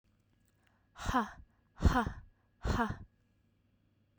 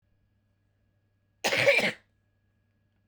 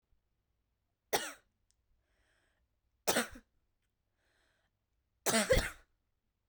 exhalation_length: 4.2 s
exhalation_amplitude: 6011
exhalation_signal_mean_std_ratio: 0.35
cough_length: 3.1 s
cough_amplitude: 11564
cough_signal_mean_std_ratio: 0.31
three_cough_length: 6.5 s
three_cough_amplitude: 6402
three_cough_signal_mean_std_ratio: 0.26
survey_phase: beta (2021-08-13 to 2022-03-07)
age: 18-44
gender: Female
wearing_mask: 'No'
symptom_cough_any: true
symptom_new_continuous_cough: true
symptom_runny_or_blocked_nose: true
symptom_shortness_of_breath: true
symptom_fatigue: true
symptom_headache: true
symptom_change_to_sense_of_smell_or_taste: true
symptom_onset: 4 days
smoker_status: Never smoked
respiratory_condition_asthma: false
respiratory_condition_other: false
recruitment_source: Test and Trace
submission_delay: 2 days
covid_test_result: Positive
covid_test_method: RT-qPCR
covid_ct_value: 21.0
covid_ct_gene: ORF1ab gene
covid_ct_mean: 22.0
covid_viral_load: 59000 copies/ml
covid_viral_load_category: Low viral load (10K-1M copies/ml)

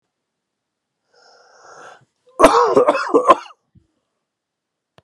three_cough_length: 5.0 s
three_cough_amplitude: 32768
three_cough_signal_mean_std_ratio: 0.32
survey_phase: beta (2021-08-13 to 2022-03-07)
age: 18-44
gender: Male
wearing_mask: 'No'
symptom_cough_any: true
symptom_new_continuous_cough: true
symptom_runny_or_blocked_nose: true
symptom_fatigue: true
symptom_fever_high_temperature: true
symptom_change_to_sense_of_smell_or_taste: true
symptom_onset: 4 days
smoker_status: Never smoked
respiratory_condition_asthma: false
respiratory_condition_other: false
recruitment_source: Test and Trace
submission_delay: 2 days
covid_test_result: Positive
covid_test_method: RT-qPCR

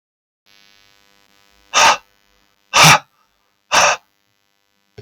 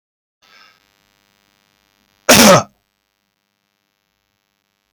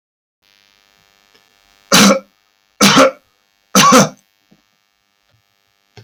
exhalation_length: 5.0 s
exhalation_amplitude: 32768
exhalation_signal_mean_std_ratio: 0.3
cough_length: 4.9 s
cough_amplitude: 32768
cough_signal_mean_std_ratio: 0.22
three_cough_length: 6.0 s
three_cough_amplitude: 32768
three_cough_signal_mean_std_ratio: 0.33
survey_phase: alpha (2021-03-01 to 2021-08-12)
age: 45-64
gender: Male
wearing_mask: 'No'
symptom_none: true
smoker_status: Never smoked
respiratory_condition_asthma: false
respiratory_condition_other: false
recruitment_source: REACT
submission_delay: 5 days
covid_test_result: Negative
covid_test_method: RT-qPCR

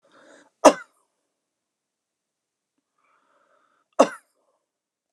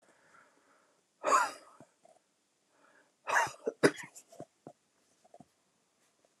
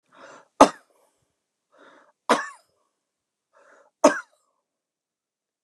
cough_length: 5.1 s
cough_amplitude: 29204
cough_signal_mean_std_ratio: 0.13
exhalation_length: 6.4 s
exhalation_amplitude: 12478
exhalation_signal_mean_std_ratio: 0.25
three_cough_length: 5.6 s
three_cough_amplitude: 29204
three_cough_signal_mean_std_ratio: 0.17
survey_phase: alpha (2021-03-01 to 2021-08-12)
age: 45-64
gender: Female
wearing_mask: 'No'
symptom_none: true
smoker_status: Ex-smoker
respiratory_condition_asthma: false
respiratory_condition_other: false
recruitment_source: REACT
submission_delay: 1 day
covid_test_result: Negative
covid_test_method: RT-qPCR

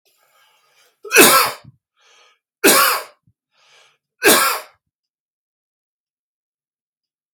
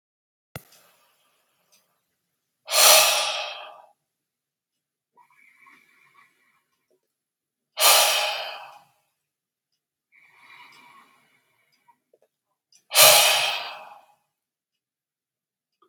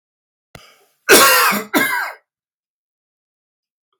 three_cough_length: 7.3 s
three_cough_amplitude: 32768
three_cough_signal_mean_std_ratio: 0.31
exhalation_length: 15.9 s
exhalation_amplitude: 32768
exhalation_signal_mean_std_ratio: 0.27
cough_length: 4.0 s
cough_amplitude: 32768
cough_signal_mean_std_ratio: 0.37
survey_phase: beta (2021-08-13 to 2022-03-07)
age: 45-64
gender: Male
wearing_mask: 'No'
symptom_cough_any: true
symptom_sore_throat: true
smoker_status: Never smoked
respiratory_condition_asthma: false
respiratory_condition_other: false
recruitment_source: REACT
submission_delay: 1 day
covid_test_result: Negative
covid_test_method: RT-qPCR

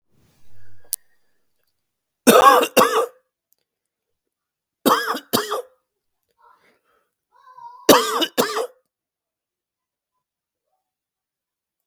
three_cough_length: 11.9 s
three_cough_amplitude: 32768
three_cough_signal_mean_std_ratio: 0.29
survey_phase: beta (2021-08-13 to 2022-03-07)
age: 18-44
gender: Male
wearing_mask: 'No'
symptom_cough_any: true
symptom_fatigue: true
symptom_headache: true
symptom_change_to_sense_of_smell_or_taste: true
symptom_loss_of_taste: true
symptom_onset: 5 days
smoker_status: Never smoked
respiratory_condition_asthma: false
respiratory_condition_other: false
recruitment_source: Test and Trace
submission_delay: 1 day
covid_test_result: Positive
covid_test_method: RT-qPCR
covid_ct_value: 29.7
covid_ct_gene: ORF1ab gene
covid_ct_mean: 30.1
covid_viral_load: 130 copies/ml
covid_viral_load_category: Minimal viral load (< 10K copies/ml)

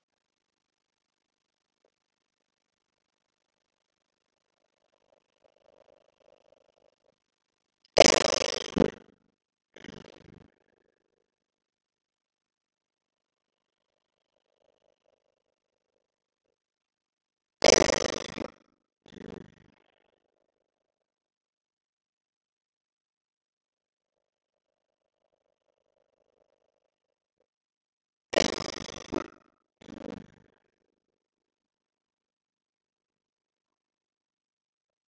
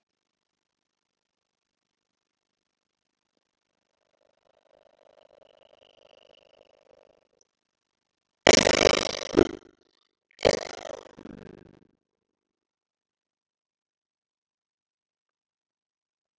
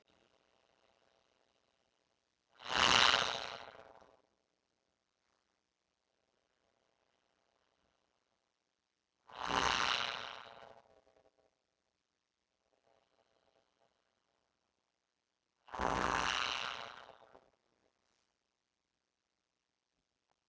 three_cough_length: 35.1 s
three_cough_amplitude: 32767
three_cough_signal_mean_std_ratio: 0.1
cough_length: 16.4 s
cough_amplitude: 32768
cough_signal_mean_std_ratio: 0.12
exhalation_length: 20.5 s
exhalation_amplitude: 7073
exhalation_signal_mean_std_ratio: 0.17
survey_phase: beta (2021-08-13 to 2022-03-07)
age: 45-64
gender: Female
wearing_mask: 'No'
symptom_none: true
smoker_status: Never smoked
respiratory_condition_asthma: false
respiratory_condition_other: false
recruitment_source: REACT
submission_delay: 6 days
covid_test_result: Negative
covid_test_method: RT-qPCR
influenza_a_test_result: Negative
influenza_b_test_result: Negative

